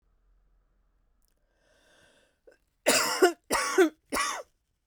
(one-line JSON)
{"three_cough_length": "4.9 s", "three_cough_amplitude": 13959, "three_cough_signal_mean_std_ratio": 0.35, "survey_phase": "beta (2021-08-13 to 2022-03-07)", "age": "45-64", "gender": "Female", "wearing_mask": "No", "symptom_cough_any": true, "symptom_runny_or_blocked_nose": true, "symptom_fatigue": true, "symptom_fever_high_temperature": true, "symptom_headache": true, "symptom_change_to_sense_of_smell_or_taste": true, "symptom_onset": "3 days", "smoker_status": "Never smoked", "respiratory_condition_asthma": false, "respiratory_condition_other": false, "recruitment_source": "Test and Trace", "submission_delay": "2 days", "covid_test_result": "Positive", "covid_test_method": "RT-qPCR"}